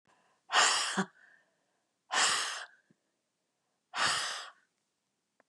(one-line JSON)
{"exhalation_length": "5.5 s", "exhalation_amplitude": 9070, "exhalation_signal_mean_std_ratio": 0.41, "survey_phase": "beta (2021-08-13 to 2022-03-07)", "age": "65+", "gender": "Female", "wearing_mask": "No", "symptom_none": true, "smoker_status": "Ex-smoker", "respiratory_condition_asthma": false, "respiratory_condition_other": false, "recruitment_source": "REACT", "submission_delay": "0 days", "covid_test_result": "Negative", "covid_test_method": "RT-qPCR", "influenza_a_test_result": "Negative", "influenza_b_test_result": "Negative"}